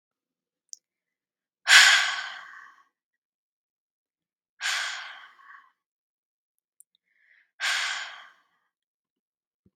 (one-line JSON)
{"exhalation_length": "9.8 s", "exhalation_amplitude": 32611, "exhalation_signal_mean_std_ratio": 0.24, "survey_phase": "beta (2021-08-13 to 2022-03-07)", "age": "18-44", "gender": "Female", "wearing_mask": "No", "symptom_runny_or_blocked_nose": true, "smoker_status": "Never smoked", "respiratory_condition_asthma": false, "respiratory_condition_other": false, "recruitment_source": "REACT", "submission_delay": "2 days", "covid_test_result": "Negative", "covid_test_method": "RT-qPCR", "influenza_a_test_result": "Negative", "influenza_b_test_result": "Negative"}